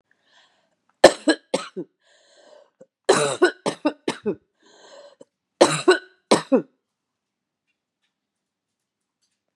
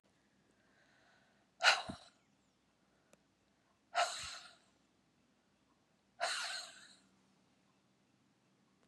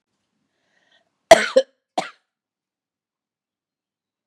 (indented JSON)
{
  "three_cough_length": "9.6 s",
  "three_cough_amplitude": 32768,
  "three_cough_signal_mean_std_ratio": 0.26,
  "exhalation_length": "8.9 s",
  "exhalation_amplitude": 5791,
  "exhalation_signal_mean_std_ratio": 0.25,
  "cough_length": "4.3 s",
  "cough_amplitude": 32768,
  "cough_signal_mean_std_ratio": 0.16,
  "survey_phase": "beta (2021-08-13 to 2022-03-07)",
  "age": "45-64",
  "gender": "Female",
  "wearing_mask": "No",
  "symptom_cough_any": true,
  "symptom_shortness_of_breath": true,
  "symptom_fatigue": true,
  "symptom_onset": "4 days",
  "smoker_status": "Never smoked",
  "respiratory_condition_asthma": false,
  "respiratory_condition_other": false,
  "recruitment_source": "Test and Trace",
  "submission_delay": "2 days",
  "covid_test_result": "Positive",
  "covid_test_method": "ePCR"
}